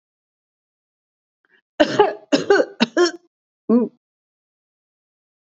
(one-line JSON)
{"three_cough_length": "5.5 s", "three_cough_amplitude": 27728, "three_cough_signal_mean_std_ratio": 0.32, "survey_phase": "beta (2021-08-13 to 2022-03-07)", "age": "65+", "gender": "Female", "wearing_mask": "No", "symptom_none": true, "smoker_status": "Ex-smoker", "respiratory_condition_asthma": false, "respiratory_condition_other": false, "recruitment_source": "REACT", "submission_delay": "1 day", "covid_test_result": "Negative", "covid_test_method": "RT-qPCR", "influenza_a_test_result": "Negative", "influenza_b_test_result": "Negative"}